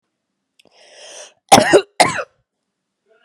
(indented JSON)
{
  "cough_length": "3.2 s",
  "cough_amplitude": 32768,
  "cough_signal_mean_std_ratio": 0.28,
  "survey_phase": "beta (2021-08-13 to 2022-03-07)",
  "age": "18-44",
  "gender": "Female",
  "wearing_mask": "No",
  "symptom_runny_or_blocked_nose": true,
  "symptom_headache": true,
  "smoker_status": "Ex-smoker",
  "respiratory_condition_asthma": false,
  "respiratory_condition_other": false,
  "recruitment_source": "Test and Trace",
  "submission_delay": "1 day",
  "covid_test_result": "Positive",
  "covid_test_method": "RT-qPCR"
}